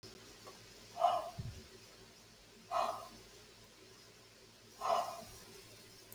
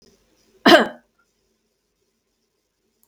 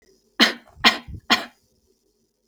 {"exhalation_length": "6.1 s", "exhalation_amplitude": 3887, "exhalation_signal_mean_std_ratio": 0.45, "cough_length": "3.1 s", "cough_amplitude": 30589, "cough_signal_mean_std_ratio": 0.2, "three_cough_length": "2.5 s", "three_cough_amplitude": 29161, "three_cough_signal_mean_std_ratio": 0.29, "survey_phase": "beta (2021-08-13 to 2022-03-07)", "age": "18-44", "gender": "Female", "wearing_mask": "No", "symptom_none": true, "smoker_status": "Never smoked", "respiratory_condition_asthma": false, "respiratory_condition_other": false, "recruitment_source": "REACT", "submission_delay": "1 day", "covid_test_result": "Negative", "covid_test_method": "RT-qPCR"}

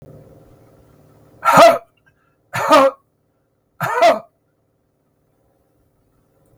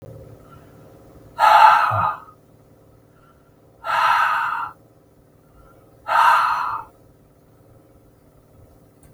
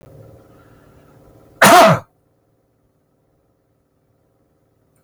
{"three_cough_length": "6.6 s", "three_cough_amplitude": 32768, "three_cough_signal_mean_std_ratio": 0.31, "exhalation_length": "9.1 s", "exhalation_amplitude": 32766, "exhalation_signal_mean_std_ratio": 0.41, "cough_length": "5.0 s", "cough_amplitude": 32768, "cough_signal_mean_std_ratio": 0.24, "survey_phase": "beta (2021-08-13 to 2022-03-07)", "age": "65+", "gender": "Male", "wearing_mask": "No", "symptom_none": true, "smoker_status": "Ex-smoker", "respiratory_condition_asthma": false, "respiratory_condition_other": false, "recruitment_source": "REACT", "submission_delay": "2 days", "covid_test_result": "Negative", "covid_test_method": "RT-qPCR", "influenza_a_test_result": "Negative", "influenza_b_test_result": "Negative"}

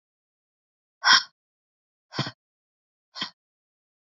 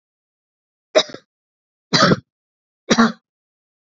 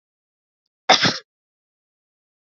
{"exhalation_length": "4.0 s", "exhalation_amplitude": 23659, "exhalation_signal_mean_std_ratio": 0.2, "three_cough_length": "3.9 s", "three_cough_amplitude": 32428, "three_cough_signal_mean_std_ratio": 0.28, "cough_length": "2.5 s", "cough_amplitude": 29121, "cough_signal_mean_std_ratio": 0.23, "survey_phase": "beta (2021-08-13 to 2022-03-07)", "age": "18-44", "gender": "Female", "wearing_mask": "No", "symptom_cough_any": true, "symptom_runny_or_blocked_nose": true, "symptom_headache": true, "symptom_loss_of_taste": true, "symptom_onset": "4 days", "smoker_status": "Never smoked", "respiratory_condition_asthma": false, "respiratory_condition_other": false, "recruitment_source": "Test and Trace", "submission_delay": "2 days", "covid_test_result": "Positive", "covid_test_method": "RT-qPCR", "covid_ct_value": 20.1, "covid_ct_gene": "ORF1ab gene"}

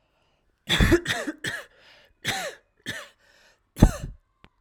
{"cough_length": "4.6 s", "cough_amplitude": 32767, "cough_signal_mean_std_ratio": 0.33, "survey_phase": "alpha (2021-03-01 to 2021-08-12)", "age": "18-44", "gender": "Female", "wearing_mask": "No", "symptom_none": true, "smoker_status": "Never smoked", "respiratory_condition_asthma": false, "respiratory_condition_other": false, "recruitment_source": "REACT", "submission_delay": "2 days", "covid_test_result": "Negative", "covid_test_method": "RT-qPCR"}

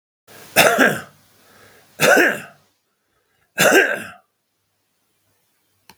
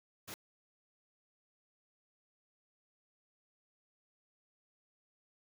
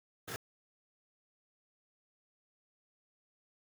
{"three_cough_length": "6.0 s", "three_cough_amplitude": 32768, "three_cough_signal_mean_std_ratio": 0.36, "exhalation_length": "5.5 s", "exhalation_amplitude": 726, "exhalation_signal_mean_std_ratio": 0.08, "cough_length": "3.7 s", "cough_amplitude": 1417, "cough_signal_mean_std_ratio": 0.12, "survey_phase": "beta (2021-08-13 to 2022-03-07)", "age": "65+", "gender": "Male", "wearing_mask": "No", "symptom_cough_any": true, "symptom_new_continuous_cough": true, "symptom_fatigue": true, "symptom_onset": "8 days", "smoker_status": "Never smoked", "respiratory_condition_asthma": false, "respiratory_condition_other": false, "recruitment_source": "REACT", "submission_delay": "2 days", "covid_test_result": "Negative", "covid_test_method": "RT-qPCR", "influenza_a_test_result": "Unknown/Void", "influenza_b_test_result": "Unknown/Void"}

